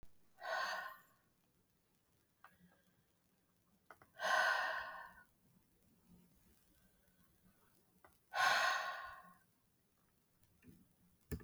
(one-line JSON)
{"exhalation_length": "11.4 s", "exhalation_amplitude": 2746, "exhalation_signal_mean_std_ratio": 0.35, "survey_phase": "beta (2021-08-13 to 2022-03-07)", "age": "45-64", "gender": "Female", "wearing_mask": "No", "symptom_none": true, "smoker_status": "Ex-smoker", "respiratory_condition_asthma": true, "respiratory_condition_other": false, "recruitment_source": "REACT", "submission_delay": "3 days", "covid_test_result": "Negative", "covid_test_method": "RT-qPCR", "influenza_a_test_result": "Negative", "influenza_b_test_result": "Negative"}